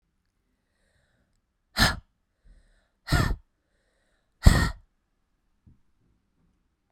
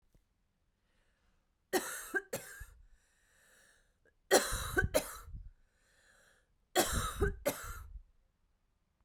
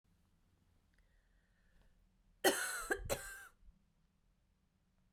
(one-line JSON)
{"exhalation_length": "6.9 s", "exhalation_amplitude": 32767, "exhalation_signal_mean_std_ratio": 0.22, "three_cough_length": "9.0 s", "three_cough_amplitude": 7867, "three_cough_signal_mean_std_ratio": 0.35, "cough_length": "5.1 s", "cough_amplitude": 4144, "cough_signal_mean_std_ratio": 0.29, "survey_phase": "beta (2021-08-13 to 2022-03-07)", "age": "45-64", "gender": "Female", "wearing_mask": "No", "symptom_cough_any": true, "symptom_runny_or_blocked_nose": true, "symptom_shortness_of_breath": true, "symptom_sore_throat": true, "symptom_abdominal_pain": true, "symptom_fatigue": true, "symptom_change_to_sense_of_smell_or_taste": true, "symptom_loss_of_taste": true, "symptom_other": true, "symptom_onset": "7 days", "smoker_status": "Ex-smoker", "respiratory_condition_asthma": true, "respiratory_condition_other": false, "recruitment_source": "Test and Trace", "submission_delay": "2 days", "covid_test_result": "Positive", "covid_test_method": "RT-qPCR", "covid_ct_value": 22.6, "covid_ct_gene": "N gene"}